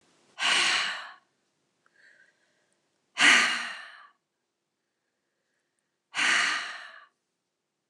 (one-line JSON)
{"exhalation_length": "7.9 s", "exhalation_amplitude": 14200, "exhalation_signal_mean_std_ratio": 0.36, "survey_phase": "alpha (2021-03-01 to 2021-08-12)", "age": "65+", "gender": "Female", "wearing_mask": "No", "symptom_fatigue": true, "smoker_status": "Never smoked", "respiratory_condition_asthma": true, "respiratory_condition_other": false, "recruitment_source": "REACT", "submission_delay": "2 days", "covid_test_result": "Negative", "covid_test_method": "RT-qPCR"}